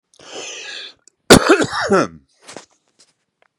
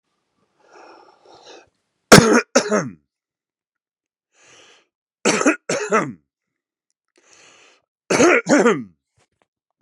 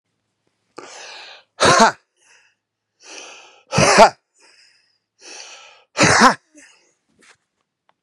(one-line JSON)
{"cough_length": "3.6 s", "cough_amplitude": 32768, "cough_signal_mean_std_ratio": 0.33, "three_cough_length": "9.8 s", "three_cough_amplitude": 32768, "three_cough_signal_mean_std_ratio": 0.31, "exhalation_length": "8.0 s", "exhalation_amplitude": 32768, "exhalation_signal_mean_std_ratio": 0.3, "survey_phase": "beta (2021-08-13 to 2022-03-07)", "age": "45-64", "gender": "Male", "wearing_mask": "No", "symptom_cough_any": true, "symptom_new_continuous_cough": true, "symptom_fatigue": true, "symptom_headache": true, "symptom_change_to_sense_of_smell_or_taste": true, "symptom_onset": "4 days", "smoker_status": "Ex-smoker", "respiratory_condition_asthma": false, "respiratory_condition_other": false, "recruitment_source": "Test and Trace", "submission_delay": "2 days", "covid_test_result": "Positive", "covid_test_method": "RT-qPCR", "covid_ct_value": 24.0, "covid_ct_gene": "ORF1ab gene", "covid_ct_mean": 24.7, "covid_viral_load": "7900 copies/ml", "covid_viral_load_category": "Minimal viral load (< 10K copies/ml)"}